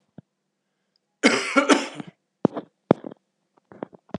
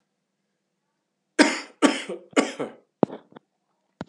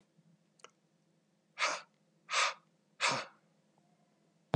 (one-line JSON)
{"cough_length": "4.2 s", "cough_amplitude": 32761, "cough_signal_mean_std_ratio": 0.28, "three_cough_length": "4.1 s", "three_cough_amplitude": 30144, "three_cough_signal_mean_std_ratio": 0.27, "exhalation_length": "4.6 s", "exhalation_amplitude": 6597, "exhalation_signal_mean_std_ratio": 0.31, "survey_phase": "beta (2021-08-13 to 2022-03-07)", "age": "18-44", "gender": "Male", "wearing_mask": "No", "symptom_cough_any": true, "symptom_new_continuous_cough": true, "symptom_runny_or_blocked_nose": true, "symptom_sore_throat": true, "symptom_fatigue": true, "symptom_onset": "3 days", "smoker_status": "Never smoked", "respiratory_condition_asthma": false, "respiratory_condition_other": false, "recruitment_source": "Test and Trace", "submission_delay": "2 days", "covid_test_result": "Positive", "covid_test_method": "RT-qPCR", "covid_ct_value": 16.3, "covid_ct_gene": "N gene", "covid_ct_mean": 16.7, "covid_viral_load": "3300000 copies/ml", "covid_viral_load_category": "High viral load (>1M copies/ml)"}